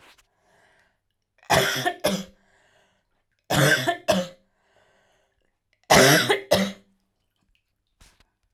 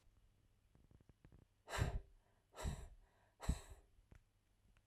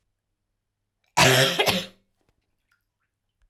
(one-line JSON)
{"three_cough_length": "8.5 s", "three_cough_amplitude": 32767, "three_cough_signal_mean_std_ratio": 0.36, "exhalation_length": "4.9 s", "exhalation_amplitude": 1621, "exhalation_signal_mean_std_ratio": 0.34, "cough_length": "3.5 s", "cough_amplitude": 22962, "cough_signal_mean_std_ratio": 0.33, "survey_phase": "alpha (2021-03-01 to 2021-08-12)", "age": "18-44", "gender": "Female", "wearing_mask": "No", "symptom_none": true, "symptom_onset": "6 days", "smoker_status": "Never smoked", "respiratory_condition_asthma": false, "respiratory_condition_other": false, "recruitment_source": "REACT", "submission_delay": "2 days", "covid_test_result": "Negative", "covid_test_method": "RT-qPCR"}